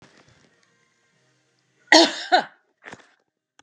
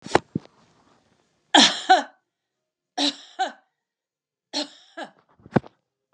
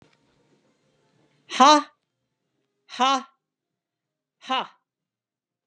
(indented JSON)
{
  "cough_length": "3.6 s",
  "cough_amplitude": 30558,
  "cough_signal_mean_std_ratio": 0.23,
  "three_cough_length": "6.1 s",
  "three_cough_amplitude": 32766,
  "three_cough_signal_mean_std_ratio": 0.26,
  "exhalation_length": "5.7 s",
  "exhalation_amplitude": 30239,
  "exhalation_signal_mean_std_ratio": 0.23,
  "survey_phase": "alpha (2021-03-01 to 2021-08-12)",
  "age": "65+",
  "gender": "Female",
  "wearing_mask": "No",
  "symptom_none": true,
  "smoker_status": "Never smoked",
  "respiratory_condition_asthma": false,
  "respiratory_condition_other": false,
  "recruitment_source": "REACT",
  "submission_delay": "1 day",
  "covid_test_result": "Negative",
  "covid_test_method": "RT-qPCR"
}